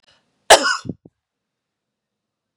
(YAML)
cough_length: 2.6 s
cough_amplitude: 32768
cough_signal_mean_std_ratio: 0.21
survey_phase: beta (2021-08-13 to 2022-03-07)
age: 45-64
gender: Female
wearing_mask: 'No'
symptom_none: true
smoker_status: Never smoked
respiratory_condition_asthma: false
respiratory_condition_other: false
recruitment_source: REACT
submission_delay: 2 days
covid_test_result: Negative
covid_test_method: RT-qPCR
influenza_a_test_result: Negative
influenza_b_test_result: Negative